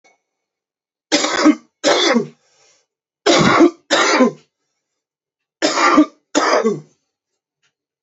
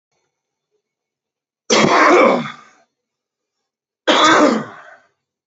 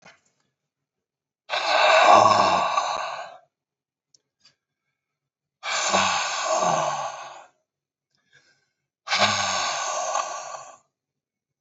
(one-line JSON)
{"three_cough_length": "8.0 s", "three_cough_amplitude": 31881, "three_cough_signal_mean_std_ratio": 0.46, "cough_length": "5.5 s", "cough_amplitude": 30050, "cough_signal_mean_std_ratio": 0.42, "exhalation_length": "11.6 s", "exhalation_amplitude": 24175, "exhalation_signal_mean_std_ratio": 0.47, "survey_phase": "beta (2021-08-13 to 2022-03-07)", "age": "18-44", "gender": "Male", "wearing_mask": "No", "symptom_cough_any": true, "symptom_runny_or_blocked_nose": true, "symptom_fatigue": true, "symptom_headache": true, "symptom_change_to_sense_of_smell_or_taste": true, "symptom_loss_of_taste": true, "symptom_onset": "3 days", "smoker_status": "Current smoker (1 to 10 cigarettes per day)", "respiratory_condition_asthma": false, "respiratory_condition_other": true, "recruitment_source": "Test and Trace", "submission_delay": "2 days", "covid_test_result": "Positive", "covid_test_method": "RT-qPCR", "covid_ct_value": 18.1, "covid_ct_gene": "ORF1ab gene", "covid_ct_mean": 18.3, "covid_viral_load": "980000 copies/ml", "covid_viral_load_category": "Low viral load (10K-1M copies/ml)"}